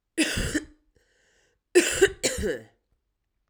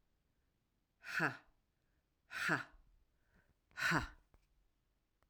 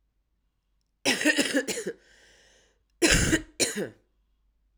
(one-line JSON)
{"three_cough_length": "3.5 s", "three_cough_amplitude": 18388, "three_cough_signal_mean_std_ratio": 0.4, "exhalation_length": "5.3 s", "exhalation_amplitude": 2988, "exhalation_signal_mean_std_ratio": 0.32, "cough_length": "4.8 s", "cough_amplitude": 21055, "cough_signal_mean_std_ratio": 0.41, "survey_phase": "alpha (2021-03-01 to 2021-08-12)", "age": "18-44", "gender": "Female", "wearing_mask": "No", "symptom_cough_any": true, "symptom_fatigue": true, "symptom_headache": true, "symptom_onset": "3 days", "smoker_status": "Ex-smoker", "respiratory_condition_asthma": false, "respiratory_condition_other": false, "recruitment_source": "Test and Trace", "submission_delay": "1 day", "covid_test_result": "Positive", "covid_test_method": "RT-qPCR", "covid_ct_value": 14.9, "covid_ct_gene": "S gene", "covid_ct_mean": 15.3, "covid_viral_load": "9200000 copies/ml", "covid_viral_load_category": "High viral load (>1M copies/ml)"}